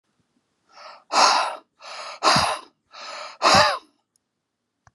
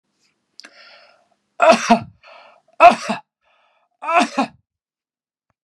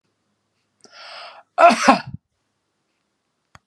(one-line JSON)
{"exhalation_length": "4.9 s", "exhalation_amplitude": 28038, "exhalation_signal_mean_std_ratio": 0.41, "three_cough_length": "5.6 s", "three_cough_amplitude": 32768, "three_cough_signal_mean_std_ratio": 0.29, "cough_length": "3.7 s", "cough_amplitude": 32767, "cough_signal_mean_std_ratio": 0.25, "survey_phase": "beta (2021-08-13 to 2022-03-07)", "age": "65+", "gender": "Male", "wearing_mask": "No", "symptom_other": true, "smoker_status": "Ex-smoker", "respiratory_condition_asthma": false, "respiratory_condition_other": false, "recruitment_source": "REACT", "submission_delay": "1 day", "covid_test_result": "Negative", "covid_test_method": "RT-qPCR", "influenza_a_test_result": "Negative", "influenza_b_test_result": "Negative"}